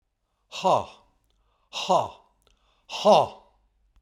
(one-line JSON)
{"exhalation_length": "4.0 s", "exhalation_amplitude": 17984, "exhalation_signal_mean_std_ratio": 0.33, "survey_phase": "beta (2021-08-13 to 2022-03-07)", "age": "45-64", "gender": "Male", "wearing_mask": "No", "symptom_none": true, "smoker_status": "Ex-smoker", "respiratory_condition_asthma": false, "respiratory_condition_other": false, "recruitment_source": "REACT", "submission_delay": "3 days", "covid_test_result": "Negative", "covid_test_method": "RT-qPCR", "influenza_a_test_result": "Negative", "influenza_b_test_result": "Negative"}